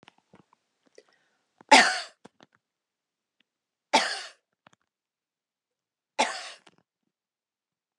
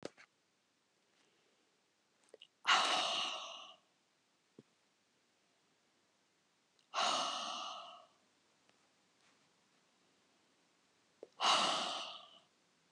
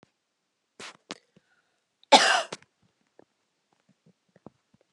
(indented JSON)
{
  "three_cough_length": "8.0 s",
  "three_cough_amplitude": 24430,
  "three_cough_signal_mean_std_ratio": 0.19,
  "exhalation_length": "12.9 s",
  "exhalation_amplitude": 4875,
  "exhalation_signal_mean_std_ratio": 0.34,
  "cough_length": "4.9 s",
  "cough_amplitude": 28588,
  "cough_signal_mean_std_ratio": 0.19,
  "survey_phase": "beta (2021-08-13 to 2022-03-07)",
  "age": "65+",
  "gender": "Female",
  "wearing_mask": "No",
  "symptom_none": true,
  "smoker_status": "Never smoked",
  "respiratory_condition_asthma": false,
  "respiratory_condition_other": false,
  "recruitment_source": "REACT",
  "submission_delay": "2 days",
  "covid_test_result": "Negative",
  "covid_test_method": "RT-qPCR"
}